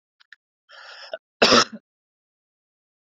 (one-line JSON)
{"cough_length": "3.1 s", "cough_amplitude": 27790, "cough_signal_mean_std_ratio": 0.23, "survey_phase": "beta (2021-08-13 to 2022-03-07)", "age": "18-44", "gender": "Male", "wearing_mask": "No", "symptom_cough_any": true, "symptom_runny_or_blocked_nose": true, "symptom_headache": true, "symptom_change_to_sense_of_smell_or_taste": true, "symptom_loss_of_taste": true, "symptom_onset": "4 days", "smoker_status": "Current smoker (e-cigarettes or vapes only)", "respiratory_condition_asthma": false, "respiratory_condition_other": false, "recruitment_source": "Test and Trace", "submission_delay": "2 days", "covid_test_result": "Positive", "covid_test_method": "RT-qPCR", "covid_ct_value": 17.6, "covid_ct_gene": "ORF1ab gene", "covid_ct_mean": 18.4, "covid_viral_load": "920000 copies/ml", "covid_viral_load_category": "Low viral load (10K-1M copies/ml)"}